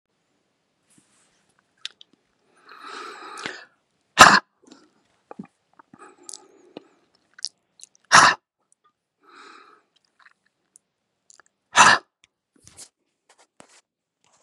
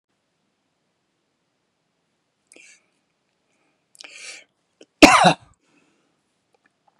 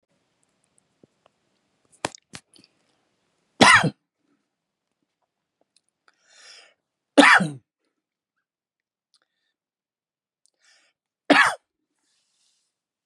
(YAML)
exhalation_length: 14.4 s
exhalation_amplitude: 32768
exhalation_signal_mean_std_ratio: 0.18
cough_length: 7.0 s
cough_amplitude: 32768
cough_signal_mean_std_ratio: 0.16
three_cough_length: 13.1 s
three_cough_amplitude: 32514
three_cough_signal_mean_std_ratio: 0.19
survey_phase: beta (2021-08-13 to 2022-03-07)
age: 45-64
gender: Male
wearing_mask: 'No'
symptom_none: true
smoker_status: Ex-smoker
respiratory_condition_asthma: false
respiratory_condition_other: false
recruitment_source: REACT
submission_delay: 5 days
covid_test_result: Negative
covid_test_method: RT-qPCR
influenza_a_test_result: Negative
influenza_b_test_result: Negative